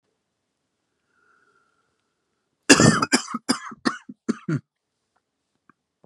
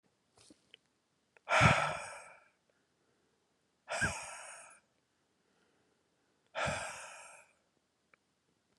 {"cough_length": "6.1 s", "cough_amplitude": 32768, "cough_signal_mean_std_ratio": 0.25, "exhalation_length": "8.8 s", "exhalation_amplitude": 9571, "exhalation_signal_mean_std_ratio": 0.29, "survey_phase": "beta (2021-08-13 to 2022-03-07)", "age": "18-44", "gender": "Male", "wearing_mask": "No", "symptom_cough_any": true, "symptom_runny_or_blocked_nose": true, "symptom_shortness_of_breath": true, "symptom_sore_throat": true, "symptom_abdominal_pain": true, "symptom_fatigue": true, "symptom_headache": true, "symptom_change_to_sense_of_smell_or_taste": true, "symptom_loss_of_taste": true, "smoker_status": "Never smoked", "respiratory_condition_asthma": false, "respiratory_condition_other": false, "recruitment_source": "Test and Trace", "submission_delay": "4 days", "covid_test_result": "Positive", "covid_test_method": "RT-qPCR", "covid_ct_value": 24.2, "covid_ct_gene": "S gene", "covid_ct_mean": 24.7, "covid_viral_load": "8000 copies/ml", "covid_viral_load_category": "Minimal viral load (< 10K copies/ml)"}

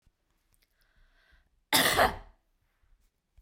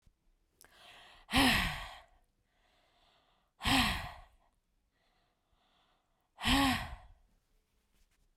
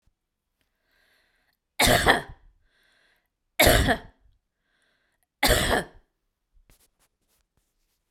{"cough_length": "3.4 s", "cough_amplitude": 12335, "cough_signal_mean_std_ratio": 0.28, "exhalation_length": "8.4 s", "exhalation_amplitude": 5782, "exhalation_signal_mean_std_ratio": 0.33, "three_cough_length": "8.1 s", "three_cough_amplitude": 26767, "three_cough_signal_mean_std_ratio": 0.3, "survey_phase": "beta (2021-08-13 to 2022-03-07)", "age": "45-64", "gender": "Female", "wearing_mask": "No", "symptom_none": true, "smoker_status": "Never smoked", "respiratory_condition_asthma": false, "respiratory_condition_other": false, "recruitment_source": "REACT", "submission_delay": "11 days", "covid_test_result": "Negative", "covid_test_method": "RT-qPCR"}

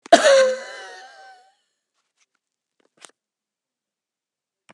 {"cough_length": "4.7 s", "cough_amplitude": 32767, "cough_signal_mean_std_ratio": 0.25, "survey_phase": "beta (2021-08-13 to 2022-03-07)", "age": "65+", "gender": "Female", "wearing_mask": "No", "symptom_cough_any": true, "symptom_shortness_of_breath": true, "symptom_fatigue": true, "symptom_onset": "12 days", "smoker_status": "Never smoked", "respiratory_condition_asthma": false, "respiratory_condition_other": true, "recruitment_source": "REACT", "submission_delay": "3 days", "covid_test_result": "Negative", "covid_test_method": "RT-qPCR", "influenza_a_test_result": "Negative", "influenza_b_test_result": "Negative"}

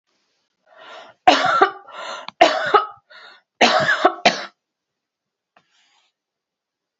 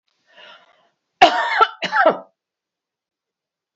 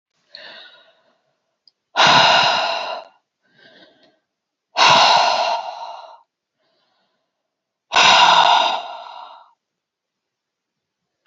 {"three_cough_length": "7.0 s", "three_cough_amplitude": 30316, "three_cough_signal_mean_std_ratio": 0.36, "cough_length": "3.8 s", "cough_amplitude": 27761, "cough_signal_mean_std_ratio": 0.32, "exhalation_length": "11.3 s", "exhalation_amplitude": 32121, "exhalation_signal_mean_std_ratio": 0.41, "survey_phase": "beta (2021-08-13 to 2022-03-07)", "age": "65+", "gender": "Female", "wearing_mask": "No", "symptom_none": true, "smoker_status": "Never smoked", "respiratory_condition_asthma": false, "respiratory_condition_other": false, "recruitment_source": "REACT", "submission_delay": "2 days", "covid_test_result": "Negative", "covid_test_method": "RT-qPCR", "influenza_a_test_result": "Negative", "influenza_b_test_result": "Negative"}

